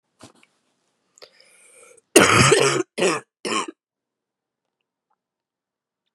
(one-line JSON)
{"cough_length": "6.1 s", "cough_amplitude": 32768, "cough_signal_mean_std_ratio": 0.31, "survey_phase": "beta (2021-08-13 to 2022-03-07)", "age": "18-44", "gender": "Female", "wearing_mask": "No", "symptom_cough_any": true, "symptom_runny_or_blocked_nose": true, "symptom_shortness_of_breath": true, "symptom_fatigue": true, "symptom_headache": true, "symptom_change_to_sense_of_smell_or_taste": true, "symptom_loss_of_taste": true, "symptom_onset": "3 days", "smoker_status": "Never smoked", "respiratory_condition_asthma": true, "respiratory_condition_other": false, "recruitment_source": "Test and Trace", "submission_delay": "1 day", "covid_test_result": "Positive", "covid_test_method": "ePCR"}